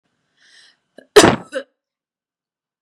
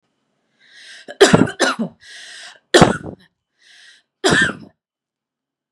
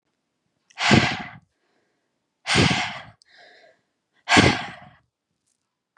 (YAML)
cough_length: 2.8 s
cough_amplitude: 32768
cough_signal_mean_std_ratio: 0.21
three_cough_length: 5.7 s
three_cough_amplitude: 32768
three_cough_signal_mean_std_ratio: 0.32
exhalation_length: 6.0 s
exhalation_amplitude: 27746
exhalation_signal_mean_std_ratio: 0.34
survey_phase: beta (2021-08-13 to 2022-03-07)
age: 18-44
gender: Female
wearing_mask: 'No'
symptom_none: true
smoker_status: Never smoked
respiratory_condition_asthma: false
respiratory_condition_other: false
recruitment_source: REACT
submission_delay: 1 day
covid_test_result: Negative
covid_test_method: RT-qPCR
influenza_a_test_result: Negative
influenza_b_test_result: Negative